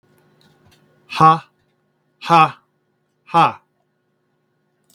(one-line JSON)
{"exhalation_length": "4.9 s", "exhalation_amplitude": 32768, "exhalation_signal_mean_std_ratio": 0.27, "survey_phase": "beta (2021-08-13 to 2022-03-07)", "age": "65+", "gender": "Male", "wearing_mask": "No", "symptom_none": true, "smoker_status": "Never smoked", "respiratory_condition_asthma": false, "respiratory_condition_other": false, "recruitment_source": "REACT", "submission_delay": "2 days", "covid_test_result": "Negative", "covid_test_method": "RT-qPCR", "influenza_a_test_result": "Negative", "influenza_b_test_result": "Negative"}